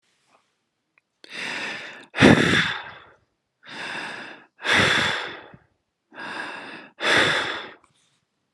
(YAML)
exhalation_length: 8.5 s
exhalation_amplitude: 32018
exhalation_signal_mean_std_ratio: 0.42
survey_phase: alpha (2021-03-01 to 2021-08-12)
age: 45-64
gender: Male
wearing_mask: 'No'
symptom_none: true
smoker_status: Never smoked
respiratory_condition_asthma: false
respiratory_condition_other: false
recruitment_source: REACT
submission_delay: 1 day
covid_test_result: Negative
covid_test_method: RT-qPCR